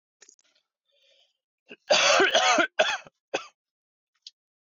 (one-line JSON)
{"cough_length": "4.7 s", "cough_amplitude": 12891, "cough_signal_mean_std_ratio": 0.38, "survey_phase": "beta (2021-08-13 to 2022-03-07)", "age": "18-44", "gender": "Male", "wearing_mask": "No", "symptom_cough_any": true, "smoker_status": "Current smoker (e-cigarettes or vapes only)", "respiratory_condition_asthma": false, "respiratory_condition_other": false, "recruitment_source": "REACT", "submission_delay": "3 days", "covid_test_result": "Negative", "covid_test_method": "RT-qPCR", "influenza_a_test_result": "Unknown/Void", "influenza_b_test_result": "Unknown/Void"}